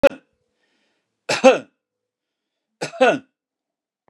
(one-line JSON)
{"three_cough_length": "4.1 s", "three_cough_amplitude": 32767, "three_cough_signal_mean_std_ratio": 0.25, "survey_phase": "beta (2021-08-13 to 2022-03-07)", "age": "45-64", "gender": "Male", "wearing_mask": "No", "symptom_none": true, "smoker_status": "Ex-smoker", "respiratory_condition_asthma": false, "respiratory_condition_other": true, "recruitment_source": "REACT", "submission_delay": "0 days", "covid_test_result": "Negative", "covid_test_method": "RT-qPCR"}